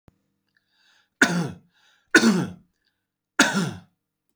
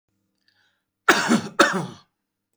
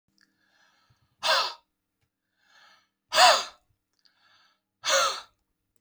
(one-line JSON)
{"three_cough_length": "4.4 s", "three_cough_amplitude": 27615, "three_cough_signal_mean_std_ratio": 0.34, "cough_length": "2.6 s", "cough_amplitude": 27322, "cough_signal_mean_std_ratio": 0.36, "exhalation_length": "5.8 s", "exhalation_amplitude": 20223, "exhalation_signal_mean_std_ratio": 0.29, "survey_phase": "alpha (2021-03-01 to 2021-08-12)", "age": "45-64", "gender": "Male", "wearing_mask": "No", "symptom_none": true, "smoker_status": "Never smoked", "respiratory_condition_asthma": true, "respiratory_condition_other": false, "recruitment_source": "REACT", "submission_delay": "1 day", "covid_test_result": "Negative", "covid_test_method": "RT-qPCR"}